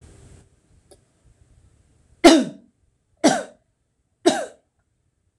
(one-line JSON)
{"three_cough_length": "5.4 s", "three_cough_amplitude": 26028, "three_cough_signal_mean_std_ratio": 0.24, "survey_phase": "beta (2021-08-13 to 2022-03-07)", "age": "45-64", "gender": "Female", "wearing_mask": "No", "symptom_none": true, "smoker_status": "Never smoked", "respiratory_condition_asthma": false, "respiratory_condition_other": false, "recruitment_source": "REACT", "submission_delay": "0 days", "covid_test_result": "Negative", "covid_test_method": "RT-qPCR"}